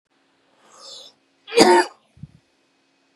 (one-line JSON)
{"cough_length": "3.2 s", "cough_amplitude": 32767, "cough_signal_mean_std_ratio": 0.27, "survey_phase": "beta (2021-08-13 to 2022-03-07)", "age": "45-64", "gender": "Male", "wearing_mask": "No", "symptom_none": true, "smoker_status": "Ex-smoker", "respiratory_condition_asthma": false, "respiratory_condition_other": false, "recruitment_source": "REACT", "submission_delay": "1 day", "covid_test_result": "Negative", "covid_test_method": "RT-qPCR", "influenza_a_test_result": "Negative", "influenza_b_test_result": "Negative"}